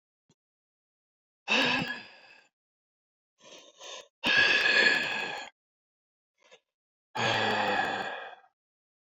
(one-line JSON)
{"exhalation_length": "9.1 s", "exhalation_amplitude": 10051, "exhalation_signal_mean_std_ratio": 0.44, "survey_phase": "beta (2021-08-13 to 2022-03-07)", "age": "45-64", "gender": "Male", "wearing_mask": "No", "symptom_new_continuous_cough": true, "symptom_fatigue": true, "symptom_fever_high_temperature": true, "symptom_onset": "3 days", "smoker_status": "Never smoked", "respiratory_condition_asthma": false, "respiratory_condition_other": false, "recruitment_source": "Test and Trace", "submission_delay": "1 day", "covid_test_result": "Positive", "covid_test_method": "ePCR"}